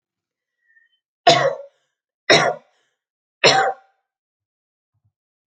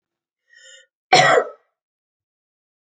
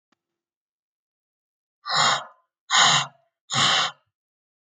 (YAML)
three_cough_length: 5.5 s
three_cough_amplitude: 31202
three_cough_signal_mean_std_ratio: 0.3
cough_length: 2.9 s
cough_amplitude: 30992
cough_signal_mean_std_ratio: 0.27
exhalation_length: 4.7 s
exhalation_amplitude: 21111
exhalation_signal_mean_std_ratio: 0.38
survey_phase: alpha (2021-03-01 to 2021-08-12)
age: 18-44
gender: Female
wearing_mask: 'No'
symptom_none: true
smoker_status: Never smoked
respiratory_condition_asthma: true
respiratory_condition_other: false
recruitment_source: REACT
submission_delay: 2 days
covid_test_result: Negative
covid_test_method: RT-qPCR